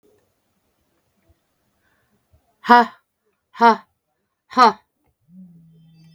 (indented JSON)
{
  "exhalation_length": "6.1 s",
  "exhalation_amplitude": 32768,
  "exhalation_signal_mean_std_ratio": 0.23,
  "survey_phase": "beta (2021-08-13 to 2022-03-07)",
  "age": "65+",
  "gender": "Female",
  "wearing_mask": "No",
  "symptom_cough_any": true,
  "symptom_runny_or_blocked_nose": true,
  "symptom_shortness_of_breath": true,
  "smoker_status": "Ex-smoker",
  "respiratory_condition_asthma": false,
  "respiratory_condition_other": true,
  "recruitment_source": "REACT",
  "submission_delay": "2 days",
  "covid_test_result": "Negative",
  "covid_test_method": "RT-qPCR",
  "influenza_a_test_result": "Negative",
  "influenza_b_test_result": "Negative"
}